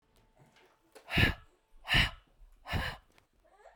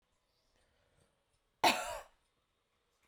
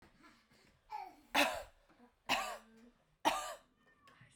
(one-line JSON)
{"exhalation_length": "3.8 s", "exhalation_amplitude": 9059, "exhalation_signal_mean_std_ratio": 0.34, "cough_length": "3.1 s", "cough_amplitude": 6215, "cough_signal_mean_std_ratio": 0.22, "three_cough_length": "4.4 s", "three_cough_amplitude": 4823, "three_cough_signal_mean_std_ratio": 0.36, "survey_phase": "beta (2021-08-13 to 2022-03-07)", "age": "18-44", "gender": "Female", "wearing_mask": "No", "symptom_none": true, "smoker_status": "Never smoked", "respiratory_condition_asthma": false, "respiratory_condition_other": false, "recruitment_source": "REACT", "submission_delay": "2 days", "covid_test_result": "Negative", "covid_test_method": "RT-qPCR", "influenza_a_test_result": "Negative", "influenza_b_test_result": "Negative"}